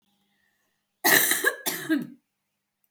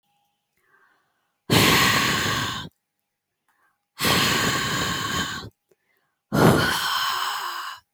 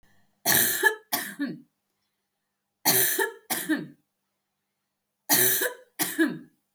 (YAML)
cough_length: 2.9 s
cough_amplitude: 23595
cough_signal_mean_std_ratio: 0.4
exhalation_length: 7.9 s
exhalation_amplitude: 24595
exhalation_signal_mean_std_ratio: 0.58
three_cough_length: 6.7 s
three_cough_amplitude: 17543
three_cough_signal_mean_std_ratio: 0.46
survey_phase: alpha (2021-03-01 to 2021-08-12)
age: 18-44
gender: Female
wearing_mask: 'No'
symptom_none: true
symptom_onset: 12 days
smoker_status: Never smoked
respiratory_condition_asthma: true
respiratory_condition_other: false
recruitment_source: REACT
submission_delay: 2 days
covid_test_result: Negative
covid_test_method: RT-qPCR